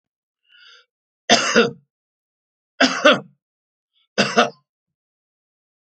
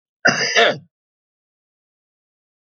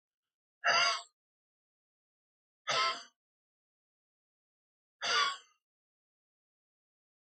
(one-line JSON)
{"three_cough_length": "5.8 s", "three_cough_amplitude": 30824, "three_cough_signal_mean_std_ratio": 0.3, "cough_length": "2.7 s", "cough_amplitude": 29737, "cough_signal_mean_std_ratio": 0.32, "exhalation_length": "7.3 s", "exhalation_amplitude": 5041, "exhalation_signal_mean_std_ratio": 0.29, "survey_phase": "alpha (2021-03-01 to 2021-08-12)", "age": "65+", "gender": "Male", "wearing_mask": "No", "symptom_none": true, "smoker_status": "Ex-smoker", "respiratory_condition_asthma": false, "respiratory_condition_other": false, "recruitment_source": "REACT", "submission_delay": "1 day", "covid_test_result": "Negative", "covid_test_method": "RT-qPCR"}